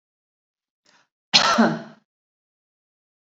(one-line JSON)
{"cough_length": "3.3 s", "cough_amplitude": 30529, "cough_signal_mean_std_ratio": 0.28, "survey_phase": "beta (2021-08-13 to 2022-03-07)", "age": "45-64", "gender": "Female", "wearing_mask": "No", "symptom_none": true, "smoker_status": "Never smoked", "respiratory_condition_asthma": false, "respiratory_condition_other": false, "recruitment_source": "REACT", "submission_delay": "5 days", "covid_test_result": "Negative", "covid_test_method": "RT-qPCR"}